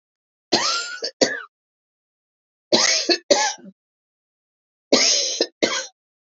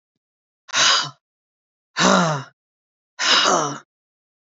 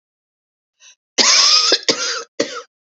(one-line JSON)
{"three_cough_length": "6.4 s", "three_cough_amplitude": 31176, "three_cough_signal_mean_std_ratio": 0.43, "exhalation_length": "4.5 s", "exhalation_amplitude": 32768, "exhalation_signal_mean_std_ratio": 0.44, "cough_length": "2.9 s", "cough_amplitude": 32271, "cough_signal_mean_std_ratio": 0.48, "survey_phase": "beta (2021-08-13 to 2022-03-07)", "age": "45-64", "gender": "Female", "wearing_mask": "No", "symptom_none": true, "smoker_status": "Never smoked", "respiratory_condition_asthma": false, "respiratory_condition_other": false, "recruitment_source": "REACT", "submission_delay": "6 days", "covid_test_result": "Negative", "covid_test_method": "RT-qPCR"}